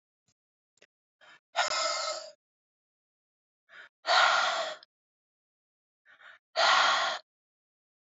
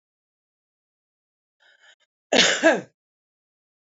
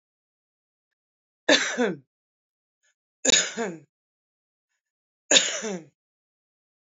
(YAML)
exhalation_length: 8.1 s
exhalation_amplitude: 9341
exhalation_signal_mean_std_ratio: 0.38
cough_length: 3.9 s
cough_amplitude: 22961
cough_signal_mean_std_ratio: 0.25
three_cough_length: 6.9 s
three_cough_amplitude: 24137
three_cough_signal_mean_std_ratio: 0.29
survey_phase: alpha (2021-03-01 to 2021-08-12)
age: 45-64
gender: Female
wearing_mask: 'No'
symptom_none: true
smoker_status: Current smoker (1 to 10 cigarettes per day)
respiratory_condition_asthma: false
respiratory_condition_other: false
recruitment_source: REACT
submission_delay: 2 days
covid_test_result: Negative
covid_test_method: RT-qPCR